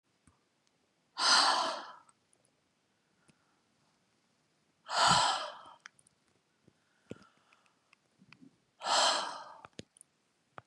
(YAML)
exhalation_length: 10.7 s
exhalation_amplitude: 7962
exhalation_signal_mean_std_ratio: 0.32
survey_phase: beta (2021-08-13 to 2022-03-07)
age: 45-64
gender: Female
wearing_mask: 'No'
symptom_none: true
smoker_status: Never smoked
respiratory_condition_asthma: false
respiratory_condition_other: false
recruitment_source: Test and Trace
submission_delay: 1 day
covid_test_result: Negative
covid_test_method: RT-qPCR